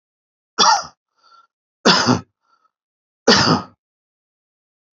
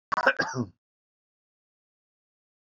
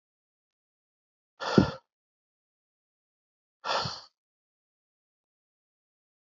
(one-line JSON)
{"three_cough_length": "4.9 s", "three_cough_amplitude": 30363, "three_cough_signal_mean_std_ratio": 0.34, "cough_length": "2.7 s", "cough_amplitude": 14599, "cough_signal_mean_std_ratio": 0.27, "exhalation_length": "6.3 s", "exhalation_amplitude": 18666, "exhalation_signal_mean_std_ratio": 0.18, "survey_phase": "beta (2021-08-13 to 2022-03-07)", "age": "45-64", "gender": "Male", "wearing_mask": "No", "symptom_none": true, "smoker_status": "Never smoked", "respiratory_condition_asthma": false, "respiratory_condition_other": false, "recruitment_source": "REACT", "submission_delay": "2 days", "covid_test_result": "Negative", "covid_test_method": "RT-qPCR", "influenza_a_test_result": "Negative", "influenza_b_test_result": "Negative"}